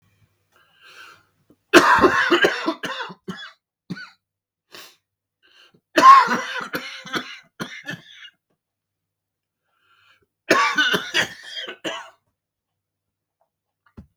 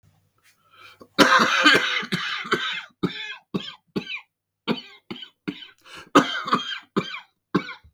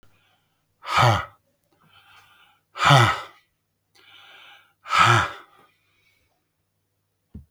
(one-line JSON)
{"three_cough_length": "14.2 s", "three_cough_amplitude": 32768, "three_cough_signal_mean_std_ratio": 0.32, "cough_length": "7.9 s", "cough_amplitude": 32768, "cough_signal_mean_std_ratio": 0.43, "exhalation_length": "7.5 s", "exhalation_amplitude": 31804, "exhalation_signal_mean_std_ratio": 0.31, "survey_phase": "beta (2021-08-13 to 2022-03-07)", "age": "45-64", "gender": "Male", "wearing_mask": "No", "symptom_cough_any": true, "symptom_runny_or_blocked_nose": true, "symptom_fatigue": true, "smoker_status": "Never smoked", "respiratory_condition_asthma": false, "respiratory_condition_other": false, "recruitment_source": "Test and Trace", "submission_delay": "1 day", "covid_test_result": "Positive", "covid_test_method": "RT-qPCR", "covid_ct_value": 25.3, "covid_ct_gene": "ORF1ab gene", "covid_ct_mean": 25.8, "covid_viral_load": "3400 copies/ml", "covid_viral_load_category": "Minimal viral load (< 10K copies/ml)"}